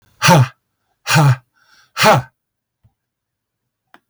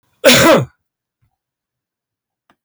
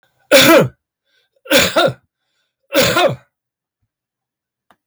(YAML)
exhalation_length: 4.1 s
exhalation_amplitude: 32768
exhalation_signal_mean_std_ratio: 0.37
cough_length: 2.6 s
cough_amplitude: 32768
cough_signal_mean_std_ratio: 0.34
three_cough_length: 4.9 s
three_cough_amplitude: 32768
three_cough_signal_mean_std_ratio: 0.4
survey_phase: beta (2021-08-13 to 2022-03-07)
age: 65+
gender: Male
wearing_mask: 'No'
symptom_none: true
smoker_status: Ex-smoker
respiratory_condition_asthma: false
respiratory_condition_other: false
recruitment_source: REACT
submission_delay: 4 days
covid_test_result: Negative
covid_test_method: RT-qPCR
influenza_a_test_result: Negative
influenza_b_test_result: Negative